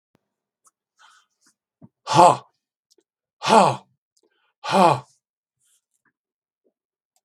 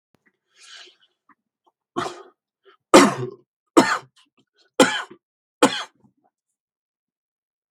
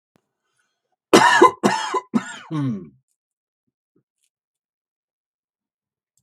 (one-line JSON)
{"exhalation_length": "7.2 s", "exhalation_amplitude": 32768, "exhalation_signal_mean_std_ratio": 0.25, "three_cough_length": "7.7 s", "three_cough_amplitude": 32768, "three_cough_signal_mean_std_ratio": 0.23, "cough_length": "6.2 s", "cough_amplitude": 32768, "cough_signal_mean_std_ratio": 0.29, "survey_phase": "beta (2021-08-13 to 2022-03-07)", "age": "65+", "gender": "Male", "wearing_mask": "No", "symptom_none": true, "smoker_status": "Ex-smoker", "respiratory_condition_asthma": false, "respiratory_condition_other": false, "recruitment_source": "REACT", "submission_delay": "4 days", "covid_test_result": "Negative", "covid_test_method": "RT-qPCR", "influenza_a_test_result": "Negative", "influenza_b_test_result": "Negative"}